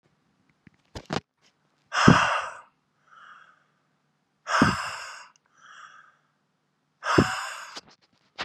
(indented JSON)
{
  "exhalation_length": "8.4 s",
  "exhalation_amplitude": 31083,
  "exhalation_signal_mean_std_ratio": 0.31,
  "survey_phase": "beta (2021-08-13 to 2022-03-07)",
  "age": "18-44",
  "gender": "Male",
  "wearing_mask": "No",
  "symptom_diarrhoea": true,
  "symptom_fatigue": true,
  "smoker_status": "Ex-smoker",
  "respiratory_condition_asthma": true,
  "respiratory_condition_other": false,
  "recruitment_source": "Test and Trace",
  "submission_delay": "5 days",
  "covid_test_result": "Negative",
  "covid_test_method": "LFT"
}